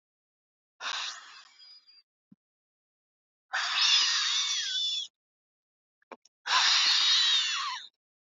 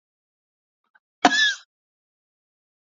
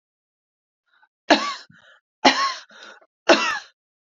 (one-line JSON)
{"exhalation_length": "8.4 s", "exhalation_amplitude": 9587, "exhalation_signal_mean_std_ratio": 0.52, "cough_length": "2.9 s", "cough_amplitude": 32767, "cough_signal_mean_std_ratio": 0.23, "three_cough_length": "4.1 s", "three_cough_amplitude": 32768, "three_cough_signal_mean_std_ratio": 0.31, "survey_phase": "beta (2021-08-13 to 2022-03-07)", "age": "18-44", "gender": "Female", "wearing_mask": "No", "symptom_cough_any": true, "symptom_sore_throat": true, "symptom_abdominal_pain": true, "symptom_fatigue": true, "symptom_fever_high_temperature": true, "symptom_headache": true, "symptom_other": true, "symptom_onset": "3 days", "smoker_status": "Never smoked", "respiratory_condition_asthma": false, "respiratory_condition_other": false, "recruitment_source": "Test and Trace", "submission_delay": "2 days", "covid_test_result": "Positive", "covid_test_method": "RT-qPCR", "covid_ct_value": 22.0, "covid_ct_gene": "N gene"}